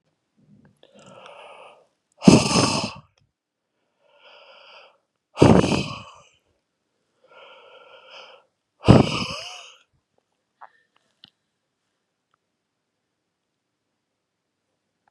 {
  "exhalation_length": "15.1 s",
  "exhalation_amplitude": 32768,
  "exhalation_signal_mean_std_ratio": 0.22,
  "survey_phase": "beta (2021-08-13 to 2022-03-07)",
  "age": "45-64",
  "gender": "Male",
  "wearing_mask": "No",
  "symptom_none": true,
  "symptom_onset": "8 days",
  "smoker_status": "Ex-smoker",
  "respiratory_condition_asthma": false,
  "respiratory_condition_other": false,
  "recruitment_source": "REACT",
  "submission_delay": "1 day",
  "covid_test_result": "Negative",
  "covid_test_method": "RT-qPCR",
  "influenza_a_test_result": "Negative",
  "influenza_b_test_result": "Negative"
}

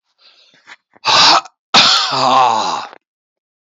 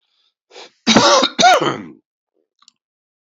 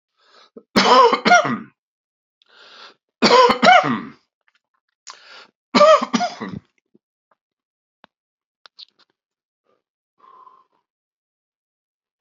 {
  "exhalation_length": "3.7 s",
  "exhalation_amplitude": 32578,
  "exhalation_signal_mean_std_ratio": 0.53,
  "cough_length": "3.2 s",
  "cough_amplitude": 32768,
  "cough_signal_mean_std_ratio": 0.4,
  "three_cough_length": "12.2 s",
  "three_cough_amplitude": 29295,
  "three_cough_signal_mean_std_ratio": 0.31,
  "survey_phase": "beta (2021-08-13 to 2022-03-07)",
  "age": "65+",
  "gender": "Male",
  "wearing_mask": "No",
  "symptom_none": true,
  "smoker_status": "Ex-smoker",
  "respiratory_condition_asthma": false,
  "respiratory_condition_other": false,
  "recruitment_source": "REACT",
  "submission_delay": "2 days",
  "covid_test_result": "Negative",
  "covid_test_method": "RT-qPCR",
  "influenza_a_test_result": "Negative",
  "influenza_b_test_result": "Negative"
}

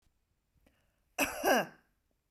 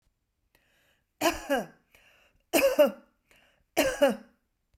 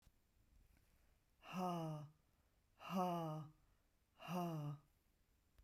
{
  "cough_length": "2.3 s",
  "cough_amplitude": 5980,
  "cough_signal_mean_std_ratio": 0.32,
  "three_cough_length": "4.8 s",
  "three_cough_amplitude": 11948,
  "three_cough_signal_mean_std_ratio": 0.36,
  "exhalation_length": "5.6 s",
  "exhalation_amplitude": 1030,
  "exhalation_signal_mean_std_ratio": 0.49,
  "survey_phase": "beta (2021-08-13 to 2022-03-07)",
  "age": "45-64",
  "gender": "Female",
  "wearing_mask": "No",
  "symptom_runny_or_blocked_nose": true,
  "symptom_onset": "8 days",
  "smoker_status": "Ex-smoker",
  "respiratory_condition_asthma": false,
  "respiratory_condition_other": false,
  "recruitment_source": "REACT",
  "submission_delay": "1 day",
  "covid_test_result": "Negative",
  "covid_test_method": "RT-qPCR"
}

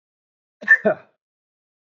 {
  "cough_length": "2.0 s",
  "cough_amplitude": 23093,
  "cough_signal_mean_std_ratio": 0.24,
  "survey_phase": "beta (2021-08-13 to 2022-03-07)",
  "age": "45-64",
  "gender": "Male",
  "wearing_mask": "No",
  "symptom_none": true,
  "smoker_status": "Never smoked",
  "respiratory_condition_asthma": false,
  "respiratory_condition_other": false,
  "recruitment_source": "REACT",
  "submission_delay": "2 days",
  "covid_test_result": "Negative",
  "covid_test_method": "RT-qPCR",
  "influenza_a_test_result": "Negative",
  "influenza_b_test_result": "Negative"
}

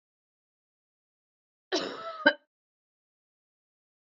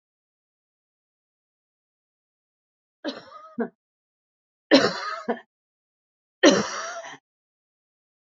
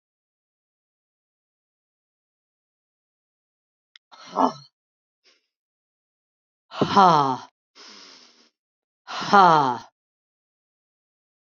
{
  "cough_length": "4.1 s",
  "cough_amplitude": 15388,
  "cough_signal_mean_std_ratio": 0.19,
  "three_cough_length": "8.4 s",
  "three_cough_amplitude": 24878,
  "three_cough_signal_mean_std_ratio": 0.23,
  "exhalation_length": "11.5 s",
  "exhalation_amplitude": 26251,
  "exhalation_signal_mean_std_ratio": 0.23,
  "survey_phase": "beta (2021-08-13 to 2022-03-07)",
  "age": "65+",
  "gender": "Female",
  "wearing_mask": "No",
  "symptom_none": true,
  "symptom_onset": "7 days",
  "smoker_status": "Ex-smoker",
  "respiratory_condition_asthma": false,
  "respiratory_condition_other": false,
  "recruitment_source": "REACT",
  "submission_delay": "2 days",
  "covid_test_result": "Negative",
  "covid_test_method": "RT-qPCR",
  "influenza_a_test_result": "Negative",
  "influenza_b_test_result": "Negative"
}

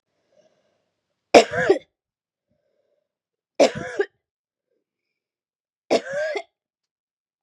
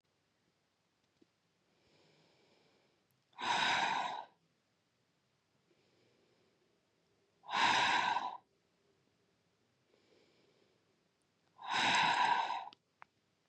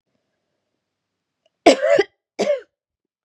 {
  "three_cough_length": "7.4 s",
  "three_cough_amplitude": 32768,
  "three_cough_signal_mean_std_ratio": 0.23,
  "exhalation_length": "13.5 s",
  "exhalation_amplitude": 3523,
  "exhalation_signal_mean_std_ratio": 0.37,
  "cough_length": "3.2 s",
  "cough_amplitude": 32767,
  "cough_signal_mean_std_ratio": 0.29,
  "survey_phase": "beta (2021-08-13 to 2022-03-07)",
  "age": "45-64",
  "gender": "Female",
  "wearing_mask": "No",
  "symptom_runny_or_blocked_nose": true,
  "symptom_sore_throat": true,
  "symptom_fatigue": true,
  "symptom_headache": true,
  "smoker_status": "Never smoked",
  "respiratory_condition_asthma": false,
  "respiratory_condition_other": false,
  "recruitment_source": "Test and Trace",
  "submission_delay": "2 days",
  "covid_test_result": "Positive",
  "covid_test_method": "RT-qPCR",
  "covid_ct_value": 24.3,
  "covid_ct_gene": "ORF1ab gene",
  "covid_ct_mean": 24.3,
  "covid_viral_load": "11000 copies/ml",
  "covid_viral_load_category": "Low viral load (10K-1M copies/ml)"
}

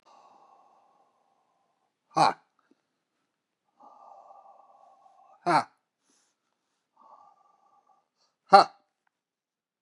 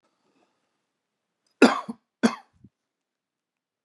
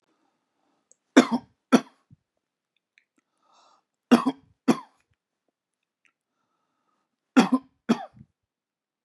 {
  "exhalation_length": "9.8 s",
  "exhalation_amplitude": 28309,
  "exhalation_signal_mean_std_ratio": 0.16,
  "cough_length": "3.8 s",
  "cough_amplitude": 26105,
  "cough_signal_mean_std_ratio": 0.18,
  "three_cough_length": "9.0 s",
  "three_cough_amplitude": 28919,
  "three_cough_signal_mean_std_ratio": 0.2,
  "survey_phase": "beta (2021-08-13 to 2022-03-07)",
  "age": "45-64",
  "gender": "Male",
  "wearing_mask": "No",
  "symptom_none": true,
  "smoker_status": "Current smoker (1 to 10 cigarettes per day)",
  "respiratory_condition_asthma": false,
  "respiratory_condition_other": false,
  "recruitment_source": "REACT",
  "submission_delay": "8 days",
  "covid_test_result": "Negative",
  "covid_test_method": "RT-qPCR",
  "influenza_a_test_result": "Negative",
  "influenza_b_test_result": "Negative"
}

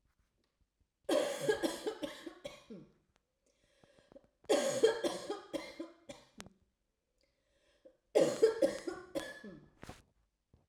{
  "three_cough_length": "10.7 s",
  "three_cough_amplitude": 5740,
  "three_cough_signal_mean_std_ratio": 0.38,
  "survey_phase": "alpha (2021-03-01 to 2021-08-12)",
  "age": "45-64",
  "gender": "Female",
  "wearing_mask": "No",
  "symptom_none": true,
  "smoker_status": "Never smoked",
  "respiratory_condition_asthma": true,
  "respiratory_condition_other": false,
  "recruitment_source": "REACT",
  "submission_delay": "2 days",
  "covid_test_result": "Negative",
  "covid_test_method": "RT-qPCR"
}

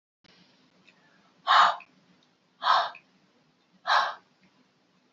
{
  "exhalation_length": "5.1 s",
  "exhalation_amplitude": 13793,
  "exhalation_signal_mean_std_ratio": 0.31,
  "survey_phase": "beta (2021-08-13 to 2022-03-07)",
  "age": "65+",
  "gender": "Female",
  "wearing_mask": "No",
  "symptom_none": true,
  "smoker_status": "Ex-smoker",
  "respiratory_condition_asthma": false,
  "respiratory_condition_other": false,
  "recruitment_source": "REACT",
  "submission_delay": "0 days",
  "covid_test_result": "Negative",
  "covid_test_method": "RT-qPCR",
  "influenza_a_test_result": "Negative",
  "influenza_b_test_result": "Negative"
}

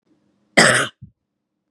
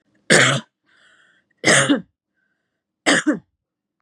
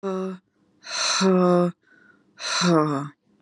{
  "cough_length": "1.7 s",
  "cough_amplitude": 32768,
  "cough_signal_mean_std_ratio": 0.32,
  "three_cough_length": "4.0 s",
  "three_cough_amplitude": 32767,
  "three_cough_signal_mean_std_ratio": 0.38,
  "exhalation_length": "3.4 s",
  "exhalation_amplitude": 17300,
  "exhalation_signal_mean_std_ratio": 0.6,
  "survey_phase": "beta (2021-08-13 to 2022-03-07)",
  "age": "18-44",
  "gender": "Female",
  "wearing_mask": "No",
  "symptom_none": true,
  "smoker_status": "Current smoker (e-cigarettes or vapes only)",
  "respiratory_condition_asthma": false,
  "respiratory_condition_other": false,
  "recruitment_source": "REACT",
  "submission_delay": "0 days",
  "covid_test_result": "Negative",
  "covid_test_method": "RT-qPCR",
  "influenza_a_test_result": "Negative",
  "influenza_b_test_result": "Negative"
}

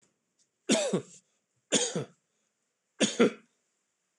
{
  "three_cough_length": "4.2 s",
  "three_cough_amplitude": 9506,
  "three_cough_signal_mean_std_ratio": 0.34,
  "survey_phase": "beta (2021-08-13 to 2022-03-07)",
  "age": "65+",
  "gender": "Male",
  "wearing_mask": "No",
  "symptom_none": true,
  "smoker_status": "Never smoked",
  "respiratory_condition_asthma": false,
  "respiratory_condition_other": false,
  "recruitment_source": "REACT",
  "submission_delay": "2 days",
  "covid_test_result": "Negative",
  "covid_test_method": "RT-qPCR",
  "influenza_a_test_result": "Negative",
  "influenza_b_test_result": "Negative"
}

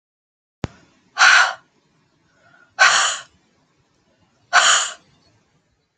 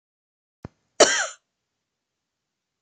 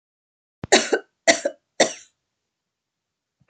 {
  "exhalation_length": "6.0 s",
  "exhalation_amplitude": 30150,
  "exhalation_signal_mean_std_ratio": 0.34,
  "cough_length": "2.8 s",
  "cough_amplitude": 30430,
  "cough_signal_mean_std_ratio": 0.2,
  "three_cough_length": "3.5 s",
  "three_cough_amplitude": 29495,
  "three_cough_signal_mean_std_ratio": 0.26,
  "survey_phase": "beta (2021-08-13 to 2022-03-07)",
  "age": "45-64",
  "gender": "Female",
  "wearing_mask": "No",
  "symptom_none": true,
  "smoker_status": "Never smoked",
  "respiratory_condition_asthma": false,
  "respiratory_condition_other": false,
  "recruitment_source": "REACT",
  "submission_delay": "2 days",
  "covid_test_result": "Negative",
  "covid_test_method": "RT-qPCR",
  "influenza_a_test_result": "Negative",
  "influenza_b_test_result": "Negative"
}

